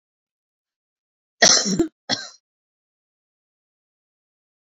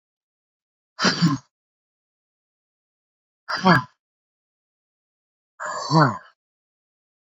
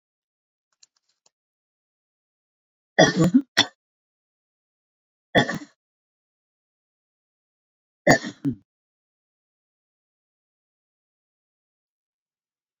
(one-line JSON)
{"cough_length": "4.6 s", "cough_amplitude": 30959, "cough_signal_mean_std_ratio": 0.24, "exhalation_length": "7.3 s", "exhalation_amplitude": 26373, "exhalation_signal_mean_std_ratio": 0.28, "three_cough_length": "12.8 s", "three_cough_amplitude": 26897, "three_cough_signal_mean_std_ratio": 0.19, "survey_phase": "beta (2021-08-13 to 2022-03-07)", "age": "45-64", "gender": "Female", "wearing_mask": "No", "symptom_none": true, "smoker_status": "Current smoker (11 or more cigarettes per day)", "respiratory_condition_asthma": false, "respiratory_condition_other": false, "recruitment_source": "REACT", "submission_delay": "7 days", "covid_test_result": "Negative", "covid_test_method": "RT-qPCR"}